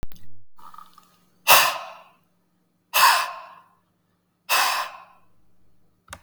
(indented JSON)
{
  "exhalation_length": "6.2 s",
  "exhalation_amplitude": 32768,
  "exhalation_signal_mean_std_ratio": 0.38,
  "survey_phase": "beta (2021-08-13 to 2022-03-07)",
  "age": "45-64",
  "gender": "Female",
  "wearing_mask": "No",
  "symptom_change_to_sense_of_smell_or_taste": true,
  "smoker_status": "Ex-smoker",
  "respiratory_condition_asthma": false,
  "respiratory_condition_other": false,
  "recruitment_source": "Test and Trace",
  "submission_delay": "9 days",
  "covid_test_result": "Negative",
  "covid_test_method": "RT-qPCR"
}